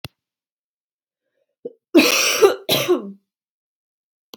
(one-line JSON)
{"cough_length": "4.4 s", "cough_amplitude": 31808, "cough_signal_mean_std_ratio": 0.35, "survey_phase": "beta (2021-08-13 to 2022-03-07)", "age": "18-44", "gender": "Female", "wearing_mask": "No", "symptom_none": true, "smoker_status": "Never smoked", "respiratory_condition_asthma": false, "respiratory_condition_other": false, "recruitment_source": "REACT", "submission_delay": "1 day", "covid_test_result": "Negative", "covid_test_method": "RT-qPCR", "influenza_a_test_result": "Unknown/Void", "influenza_b_test_result": "Unknown/Void"}